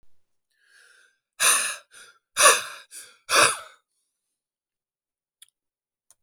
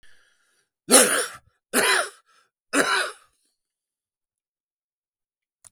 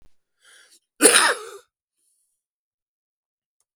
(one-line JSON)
{"exhalation_length": "6.2 s", "exhalation_amplitude": 27102, "exhalation_signal_mean_std_ratio": 0.29, "three_cough_length": "5.7 s", "three_cough_amplitude": 32766, "three_cough_signal_mean_std_ratio": 0.32, "cough_length": "3.8 s", "cough_amplitude": 32768, "cough_signal_mean_std_ratio": 0.24, "survey_phase": "beta (2021-08-13 to 2022-03-07)", "age": "65+", "gender": "Male", "wearing_mask": "No", "symptom_cough_any": true, "symptom_fatigue": true, "symptom_onset": "4 days", "smoker_status": "Ex-smoker", "respiratory_condition_asthma": false, "respiratory_condition_other": false, "recruitment_source": "Test and Trace", "submission_delay": "2 days", "covid_test_result": "Positive", "covid_test_method": "RT-qPCR"}